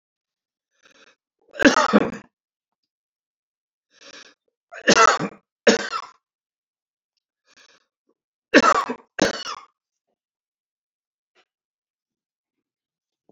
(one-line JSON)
{"three_cough_length": "13.3 s", "three_cough_amplitude": 29328, "three_cough_signal_mean_std_ratio": 0.25, "survey_phase": "beta (2021-08-13 to 2022-03-07)", "age": "65+", "gender": "Male", "wearing_mask": "No", "symptom_none": true, "smoker_status": "Ex-smoker", "respiratory_condition_asthma": true, "respiratory_condition_other": false, "recruitment_source": "REACT", "submission_delay": "1 day", "covid_test_result": "Negative", "covid_test_method": "RT-qPCR"}